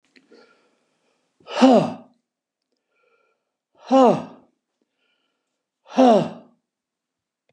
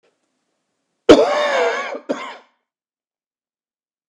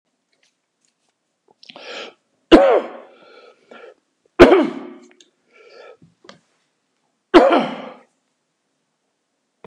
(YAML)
exhalation_length: 7.5 s
exhalation_amplitude: 28672
exhalation_signal_mean_std_ratio: 0.28
cough_length: 4.1 s
cough_amplitude: 32768
cough_signal_mean_std_ratio: 0.32
three_cough_length: 9.7 s
three_cough_amplitude: 32768
three_cough_signal_mean_std_ratio: 0.26
survey_phase: beta (2021-08-13 to 2022-03-07)
age: 65+
gender: Male
wearing_mask: 'No'
symptom_none: true
smoker_status: Ex-smoker
respiratory_condition_asthma: false
respiratory_condition_other: false
recruitment_source: REACT
submission_delay: 1 day
covid_test_result: Negative
covid_test_method: RT-qPCR
influenza_a_test_result: Negative
influenza_b_test_result: Negative